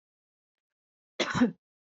{"cough_length": "1.9 s", "cough_amplitude": 7473, "cough_signal_mean_std_ratio": 0.29, "survey_phase": "beta (2021-08-13 to 2022-03-07)", "age": "45-64", "gender": "Female", "wearing_mask": "No", "symptom_none": true, "smoker_status": "Never smoked", "respiratory_condition_asthma": false, "respiratory_condition_other": false, "recruitment_source": "REACT", "submission_delay": "2 days", "covid_test_result": "Negative", "covid_test_method": "RT-qPCR", "influenza_a_test_result": "Negative", "influenza_b_test_result": "Negative"}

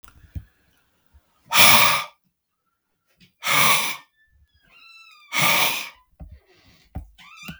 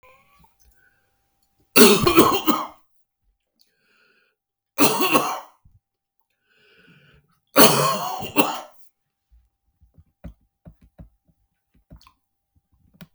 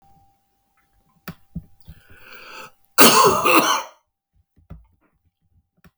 {"exhalation_length": "7.6 s", "exhalation_amplitude": 32768, "exhalation_signal_mean_std_ratio": 0.36, "three_cough_length": "13.1 s", "three_cough_amplitude": 32768, "three_cough_signal_mean_std_ratio": 0.29, "cough_length": "6.0 s", "cough_amplitude": 32768, "cough_signal_mean_std_ratio": 0.3, "survey_phase": "beta (2021-08-13 to 2022-03-07)", "age": "65+", "gender": "Male", "wearing_mask": "No", "symptom_none": true, "smoker_status": "Never smoked", "respiratory_condition_asthma": false, "respiratory_condition_other": false, "recruitment_source": "REACT", "submission_delay": "2 days", "covid_test_result": "Negative", "covid_test_method": "RT-qPCR", "influenza_a_test_result": "Negative", "influenza_b_test_result": "Negative"}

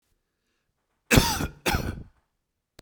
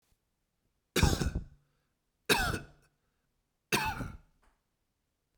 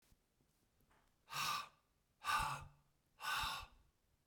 {"cough_length": "2.8 s", "cough_amplitude": 31110, "cough_signal_mean_std_ratio": 0.33, "three_cough_length": "5.4 s", "three_cough_amplitude": 8809, "three_cough_signal_mean_std_ratio": 0.33, "exhalation_length": "4.3 s", "exhalation_amplitude": 1640, "exhalation_signal_mean_std_ratio": 0.44, "survey_phase": "beta (2021-08-13 to 2022-03-07)", "age": "45-64", "gender": "Male", "wearing_mask": "No", "symptom_none": true, "smoker_status": "Never smoked", "respiratory_condition_asthma": false, "respiratory_condition_other": false, "recruitment_source": "REACT", "submission_delay": "1 day", "covid_test_result": "Negative", "covid_test_method": "RT-qPCR", "influenza_a_test_result": "Negative", "influenza_b_test_result": "Negative"}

